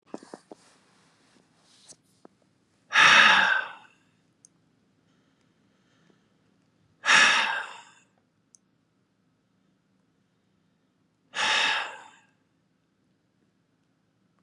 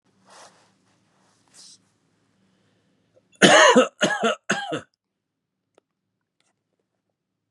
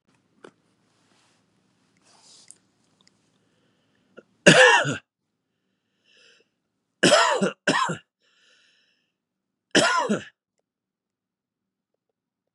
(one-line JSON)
{"exhalation_length": "14.4 s", "exhalation_amplitude": 22342, "exhalation_signal_mean_std_ratio": 0.28, "cough_length": "7.5 s", "cough_amplitude": 31831, "cough_signal_mean_std_ratio": 0.26, "three_cough_length": "12.5 s", "three_cough_amplitude": 32767, "three_cough_signal_mean_std_ratio": 0.27, "survey_phase": "beta (2021-08-13 to 2022-03-07)", "age": "45-64", "gender": "Male", "wearing_mask": "No", "symptom_none": true, "smoker_status": "Never smoked", "respiratory_condition_asthma": false, "respiratory_condition_other": false, "recruitment_source": "REACT", "submission_delay": "1 day", "covid_test_result": "Negative", "covid_test_method": "RT-qPCR"}